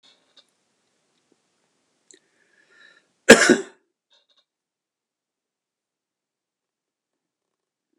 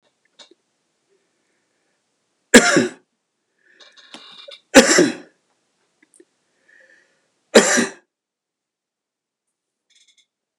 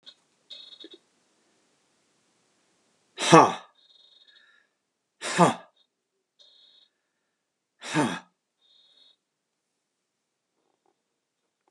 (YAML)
cough_length: 8.0 s
cough_amplitude: 32768
cough_signal_mean_std_ratio: 0.13
three_cough_length: 10.6 s
three_cough_amplitude: 32768
three_cough_signal_mean_std_ratio: 0.22
exhalation_length: 11.7 s
exhalation_amplitude: 32765
exhalation_signal_mean_std_ratio: 0.18
survey_phase: beta (2021-08-13 to 2022-03-07)
age: 65+
gender: Male
wearing_mask: 'No'
symptom_none: true
smoker_status: Never smoked
respiratory_condition_asthma: false
respiratory_condition_other: false
recruitment_source: REACT
submission_delay: 2 days
covid_test_result: Negative
covid_test_method: RT-qPCR